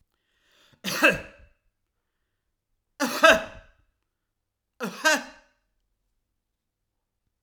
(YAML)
cough_length: 7.4 s
cough_amplitude: 27244
cough_signal_mean_std_ratio: 0.25
survey_phase: alpha (2021-03-01 to 2021-08-12)
age: 65+
gender: Male
wearing_mask: 'No'
symptom_none: true
smoker_status: Ex-smoker
respiratory_condition_asthma: false
respiratory_condition_other: false
recruitment_source: REACT
submission_delay: 2 days
covid_test_result: Negative
covid_test_method: RT-qPCR